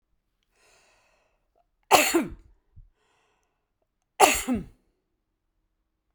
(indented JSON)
{
  "cough_length": "6.1 s",
  "cough_amplitude": 31821,
  "cough_signal_mean_std_ratio": 0.25,
  "survey_phase": "beta (2021-08-13 to 2022-03-07)",
  "age": "65+",
  "gender": "Female",
  "wearing_mask": "No",
  "symptom_none": true,
  "smoker_status": "Never smoked",
  "respiratory_condition_asthma": false,
  "respiratory_condition_other": false,
  "recruitment_source": "REACT",
  "submission_delay": "1 day",
  "covid_test_result": "Negative",
  "covid_test_method": "RT-qPCR"
}